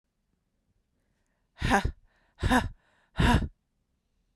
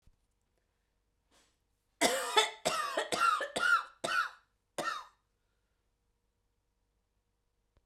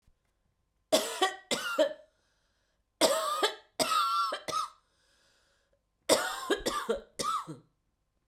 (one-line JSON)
{"exhalation_length": "4.4 s", "exhalation_amplitude": 10374, "exhalation_signal_mean_std_ratio": 0.34, "cough_length": "7.9 s", "cough_amplitude": 9498, "cough_signal_mean_std_ratio": 0.39, "three_cough_length": "8.3 s", "three_cough_amplitude": 13979, "three_cough_signal_mean_std_ratio": 0.48, "survey_phase": "beta (2021-08-13 to 2022-03-07)", "age": "18-44", "gender": "Female", "wearing_mask": "No", "symptom_cough_any": true, "symptom_runny_or_blocked_nose": true, "symptom_other": true, "symptom_onset": "3 days", "smoker_status": "Ex-smoker", "respiratory_condition_asthma": false, "respiratory_condition_other": false, "recruitment_source": "Test and Trace", "submission_delay": "2 days", "covid_test_result": "Positive", "covid_test_method": "RT-qPCR", "covid_ct_value": 22.4, "covid_ct_gene": "ORF1ab gene"}